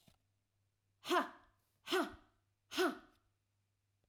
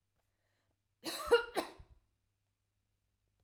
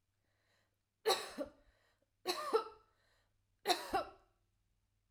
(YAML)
exhalation_length: 4.1 s
exhalation_amplitude: 2272
exhalation_signal_mean_std_ratio: 0.32
cough_length: 3.4 s
cough_amplitude: 4464
cough_signal_mean_std_ratio: 0.24
three_cough_length: 5.1 s
three_cough_amplitude: 4997
three_cough_signal_mean_std_ratio: 0.33
survey_phase: alpha (2021-03-01 to 2021-08-12)
age: 45-64
gender: Female
wearing_mask: 'No'
symptom_none: true
smoker_status: Never smoked
respiratory_condition_asthma: false
respiratory_condition_other: false
recruitment_source: REACT
submission_delay: 1 day
covid_test_result: Negative
covid_test_method: RT-qPCR